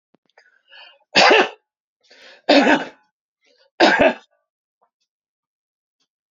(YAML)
three_cough_length: 6.3 s
three_cough_amplitude: 30724
three_cough_signal_mean_std_ratio: 0.32
survey_phase: beta (2021-08-13 to 2022-03-07)
age: 65+
gender: Male
wearing_mask: 'No'
symptom_none: true
smoker_status: Ex-smoker
respiratory_condition_asthma: false
respiratory_condition_other: false
recruitment_source: REACT
submission_delay: 2 days
covid_test_result: Negative
covid_test_method: RT-qPCR